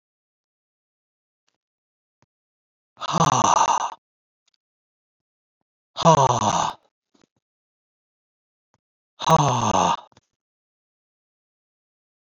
{"exhalation_length": "12.3 s", "exhalation_amplitude": 24347, "exhalation_signal_mean_std_ratio": 0.31, "survey_phase": "beta (2021-08-13 to 2022-03-07)", "age": "65+", "gender": "Male", "wearing_mask": "No", "symptom_cough_any": true, "symptom_runny_or_blocked_nose": true, "symptom_onset": "12 days", "smoker_status": "Never smoked", "respiratory_condition_asthma": false, "respiratory_condition_other": false, "recruitment_source": "REACT", "submission_delay": "1 day", "covid_test_result": "Negative", "covid_test_method": "RT-qPCR", "influenza_a_test_result": "Negative", "influenza_b_test_result": "Negative"}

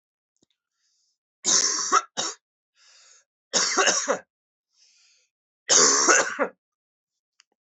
{"three_cough_length": "7.8 s", "three_cough_amplitude": 25743, "three_cough_signal_mean_std_ratio": 0.39, "survey_phase": "alpha (2021-03-01 to 2021-08-12)", "age": "18-44", "gender": "Male", "wearing_mask": "No", "symptom_cough_any": true, "symptom_fever_high_temperature": true, "symptom_headache": true, "symptom_onset": "2 days", "smoker_status": "Never smoked", "respiratory_condition_asthma": false, "respiratory_condition_other": false, "recruitment_source": "Test and Trace", "submission_delay": "1 day", "covid_test_result": "Positive", "covid_test_method": "RT-qPCR", "covid_ct_value": 21.2, "covid_ct_gene": "ORF1ab gene", "covid_ct_mean": 21.7, "covid_viral_load": "77000 copies/ml", "covid_viral_load_category": "Low viral load (10K-1M copies/ml)"}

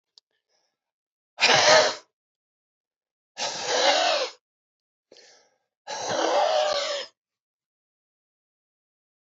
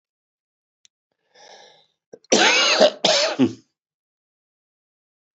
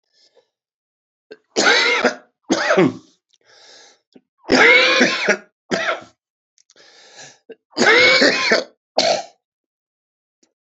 {"exhalation_length": "9.2 s", "exhalation_amplitude": 23032, "exhalation_signal_mean_std_ratio": 0.4, "cough_length": "5.4 s", "cough_amplitude": 27992, "cough_signal_mean_std_ratio": 0.35, "three_cough_length": "10.8 s", "three_cough_amplitude": 30487, "three_cough_signal_mean_std_ratio": 0.44, "survey_phase": "beta (2021-08-13 to 2022-03-07)", "age": "65+", "gender": "Male", "wearing_mask": "No", "symptom_cough_any": true, "symptom_new_continuous_cough": true, "symptom_shortness_of_breath": true, "symptom_fatigue": true, "symptom_other": true, "symptom_onset": "7 days", "smoker_status": "Ex-smoker", "respiratory_condition_asthma": false, "respiratory_condition_other": true, "recruitment_source": "Test and Trace", "submission_delay": "2 days", "covid_test_result": "Positive", "covid_test_method": "LAMP"}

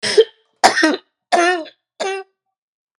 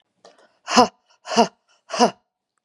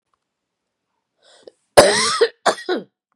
{"three_cough_length": "3.0 s", "three_cough_amplitude": 32768, "three_cough_signal_mean_std_ratio": 0.44, "exhalation_length": "2.6 s", "exhalation_amplitude": 32767, "exhalation_signal_mean_std_ratio": 0.29, "cough_length": "3.2 s", "cough_amplitude": 32768, "cough_signal_mean_std_ratio": 0.33, "survey_phase": "beta (2021-08-13 to 2022-03-07)", "age": "45-64", "gender": "Female", "wearing_mask": "No", "symptom_cough_any": true, "symptom_new_continuous_cough": true, "symptom_runny_or_blocked_nose": true, "symptom_sore_throat": true, "symptom_fatigue": true, "symptom_fever_high_temperature": true, "symptom_onset": "6 days", "smoker_status": "Never smoked", "respiratory_condition_asthma": false, "respiratory_condition_other": false, "recruitment_source": "Test and Trace", "submission_delay": "1 day", "covid_test_result": "Negative", "covid_test_method": "RT-qPCR"}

